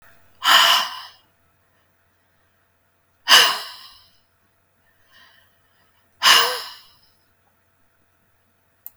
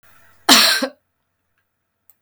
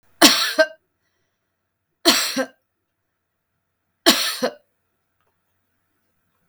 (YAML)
exhalation_length: 9.0 s
exhalation_amplitude: 32562
exhalation_signal_mean_std_ratio: 0.28
cough_length: 2.2 s
cough_amplitude: 32562
cough_signal_mean_std_ratio: 0.32
three_cough_length: 6.5 s
three_cough_amplitude: 32562
three_cough_signal_mean_std_ratio: 0.29
survey_phase: beta (2021-08-13 to 2022-03-07)
age: 45-64
gender: Female
wearing_mask: 'No'
symptom_none: true
smoker_status: Ex-smoker
respiratory_condition_asthma: false
respiratory_condition_other: false
recruitment_source: REACT
submission_delay: 4 days
covid_test_result: Negative
covid_test_method: RT-qPCR
influenza_a_test_result: Unknown/Void
influenza_b_test_result: Unknown/Void